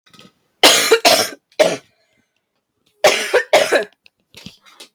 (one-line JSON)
{"three_cough_length": "4.9 s", "three_cough_amplitude": 32768, "three_cough_signal_mean_std_ratio": 0.42, "survey_phase": "beta (2021-08-13 to 2022-03-07)", "age": "18-44", "gender": "Female", "wearing_mask": "No", "symptom_cough_any": true, "symptom_runny_or_blocked_nose": true, "symptom_shortness_of_breath": true, "symptom_fatigue": true, "symptom_headache": true, "symptom_onset": "10 days", "smoker_status": "Ex-smoker", "respiratory_condition_asthma": false, "respiratory_condition_other": false, "recruitment_source": "Test and Trace", "submission_delay": "3 days", "covid_test_result": "Positive", "covid_test_method": "RT-qPCR", "covid_ct_value": 23.1, "covid_ct_gene": "ORF1ab gene", "covid_ct_mean": 23.8, "covid_viral_load": "16000 copies/ml", "covid_viral_load_category": "Low viral load (10K-1M copies/ml)"}